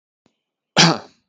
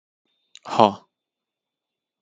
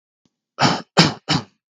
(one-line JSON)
{"cough_length": "1.3 s", "cough_amplitude": 32768, "cough_signal_mean_std_ratio": 0.3, "exhalation_length": "2.2 s", "exhalation_amplitude": 32768, "exhalation_signal_mean_std_ratio": 0.18, "three_cough_length": "1.7 s", "three_cough_amplitude": 32768, "three_cough_signal_mean_std_ratio": 0.4, "survey_phase": "beta (2021-08-13 to 2022-03-07)", "age": "18-44", "gender": "Male", "wearing_mask": "No", "symptom_sore_throat": true, "smoker_status": "Never smoked", "respiratory_condition_asthma": false, "respiratory_condition_other": false, "recruitment_source": "REACT", "submission_delay": "2 days", "covid_test_result": "Negative", "covid_test_method": "RT-qPCR", "influenza_a_test_result": "Negative", "influenza_b_test_result": "Negative"}